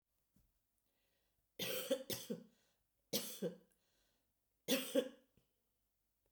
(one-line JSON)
{"three_cough_length": "6.3 s", "three_cough_amplitude": 2355, "three_cough_signal_mean_std_ratio": 0.34, "survey_phase": "beta (2021-08-13 to 2022-03-07)", "age": "45-64", "gender": "Female", "wearing_mask": "No", "symptom_cough_any": true, "symptom_runny_or_blocked_nose": true, "symptom_sore_throat": true, "smoker_status": "Never smoked", "respiratory_condition_asthma": false, "respiratory_condition_other": false, "recruitment_source": "Test and Trace", "submission_delay": "0 days", "covid_test_result": "Positive", "covid_test_method": "LFT"}